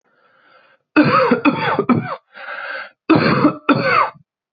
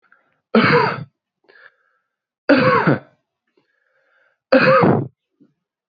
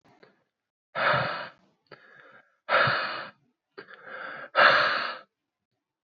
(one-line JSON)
{"cough_length": "4.5 s", "cough_amplitude": 27484, "cough_signal_mean_std_ratio": 0.57, "three_cough_length": "5.9 s", "three_cough_amplitude": 27375, "three_cough_signal_mean_std_ratio": 0.41, "exhalation_length": "6.1 s", "exhalation_amplitude": 21666, "exhalation_signal_mean_std_ratio": 0.41, "survey_phase": "beta (2021-08-13 to 2022-03-07)", "age": "18-44", "gender": "Male", "wearing_mask": "No", "symptom_cough_any": true, "symptom_sore_throat": true, "symptom_fatigue": true, "symptom_headache": true, "symptom_onset": "5 days", "smoker_status": "Never smoked", "respiratory_condition_asthma": false, "respiratory_condition_other": false, "recruitment_source": "Test and Trace", "submission_delay": "2 days", "covid_test_result": "Positive", "covid_test_method": "RT-qPCR", "covid_ct_value": 14.1, "covid_ct_gene": "ORF1ab gene", "covid_ct_mean": 14.2, "covid_viral_load": "22000000 copies/ml", "covid_viral_load_category": "High viral load (>1M copies/ml)"}